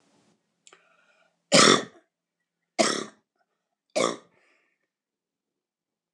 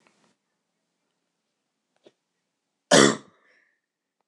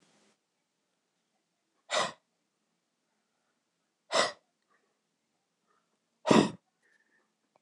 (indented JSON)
{
  "three_cough_length": "6.1 s",
  "three_cough_amplitude": 23907,
  "three_cough_signal_mean_std_ratio": 0.24,
  "cough_length": "4.3 s",
  "cough_amplitude": 26027,
  "cough_signal_mean_std_ratio": 0.17,
  "exhalation_length": "7.6 s",
  "exhalation_amplitude": 14874,
  "exhalation_signal_mean_std_ratio": 0.2,
  "survey_phase": "beta (2021-08-13 to 2022-03-07)",
  "age": "45-64",
  "gender": "Male",
  "wearing_mask": "No",
  "symptom_none": true,
  "smoker_status": "Never smoked",
  "respiratory_condition_asthma": true,
  "respiratory_condition_other": false,
  "recruitment_source": "REACT",
  "submission_delay": "2 days",
  "covid_test_result": "Negative",
  "covid_test_method": "RT-qPCR",
  "influenza_a_test_result": "Negative",
  "influenza_b_test_result": "Negative"
}